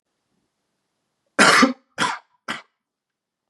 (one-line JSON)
{"cough_length": "3.5 s", "cough_amplitude": 31338, "cough_signal_mean_std_ratio": 0.29, "survey_phase": "beta (2021-08-13 to 2022-03-07)", "age": "18-44", "gender": "Male", "wearing_mask": "No", "symptom_cough_any": true, "symptom_runny_or_blocked_nose": true, "symptom_sore_throat": true, "symptom_fatigue": true, "symptom_onset": "4 days", "smoker_status": "Never smoked", "respiratory_condition_asthma": false, "respiratory_condition_other": false, "recruitment_source": "Test and Trace", "submission_delay": "2 days", "covid_test_result": "Negative", "covid_test_method": "RT-qPCR"}